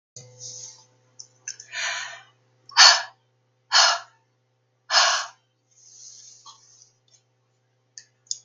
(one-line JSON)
{"exhalation_length": "8.4 s", "exhalation_amplitude": 32767, "exhalation_signal_mean_std_ratio": 0.28, "survey_phase": "beta (2021-08-13 to 2022-03-07)", "age": "65+", "gender": "Female", "wearing_mask": "No", "symptom_none": true, "smoker_status": "Ex-smoker", "respiratory_condition_asthma": false, "respiratory_condition_other": false, "recruitment_source": "REACT", "submission_delay": "2 days", "covid_test_result": "Negative", "covid_test_method": "RT-qPCR", "influenza_a_test_result": "Negative", "influenza_b_test_result": "Positive", "influenza_b_ct_value": 35.7}